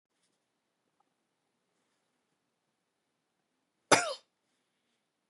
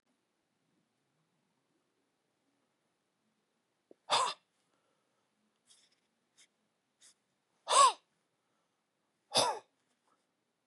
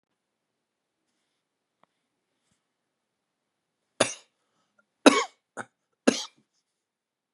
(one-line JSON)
{"cough_length": "5.3 s", "cough_amplitude": 16545, "cough_signal_mean_std_ratio": 0.13, "exhalation_length": "10.7 s", "exhalation_amplitude": 7716, "exhalation_signal_mean_std_ratio": 0.19, "three_cough_length": "7.3 s", "three_cough_amplitude": 29117, "three_cough_signal_mean_std_ratio": 0.14, "survey_phase": "beta (2021-08-13 to 2022-03-07)", "age": "45-64", "gender": "Male", "wearing_mask": "No", "symptom_cough_any": true, "symptom_sore_throat": true, "symptom_headache": true, "symptom_onset": "2 days", "smoker_status": "Never smoked", "respiratory_condition_asthma": false, "respiratory_condition_other": false, "recruitment_source": "Test and Trace", "submission_delay": "2 days", "covid_test_result": "Positive", "covid_test_method": "RT-qPCR", "covid_ct_value": 15.6, "covid_ct_gene": "N gene", "covid_ct_mean": 15.7, "covid_viral_load": "7000000 copies/ml", "covid_viral_load_category": "High viral load (>1M copies/ml)"}